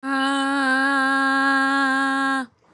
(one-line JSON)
{"exhalation_length": "2.7 s", "exhalation_amplitude": 11799, "exhalation_signal_mean_std_ratio": 1.18, "survey_phase": "beta (2021-08-13 to 2022-03-07)", "age": "45-64", "gender": "Female", "wearing_mask": "No", "symptom_none": true, "smoker_status": "Ex-smoker", "respiratory_condition_asthma": false, "respiratory_condition_other": false, "recruitment_source": "REACT", "submission_delay": "1 day", "covid_test_result": "Negative", "covid_test_method": "RT-qPCR"}